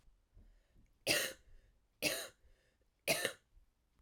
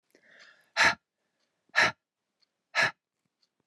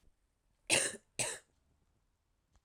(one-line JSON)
{"three_cough_length": "4.0 s", "three_cough_amplitude": 4639, "three_cough_signal_mean_std_ratio": 0.35, "exhalation_length": "3.7 s", "exhalation_amplitude": 11076, "exhalation_signal_mean_std_ratio": 0.28, "cough_length": "2.6 s", "cough_amplitude": 6022, "cough_signal_mean_std_ratio": 0.29, "survey_phase": "alpha (2021-03-01 to 2021-08-12)", "age": "18-44", "gender": "Female", "wearing_mask": "No", "symptom_cough_any": true, "symptom_fatigue": true, "symptom_headache": true, "smoker_status": "Never smoked", "respiratory_condition_asthma": false, "respiratory_condition_other": false, "recruitment_source": "Test and Trace", "submission_delay": "1 day", "covid_test_result": "Positive", "covid_test_method": "RT-qPCR", "covid_ct_value": 28.1, "covid_ct_gene": "ORF1ab gene"}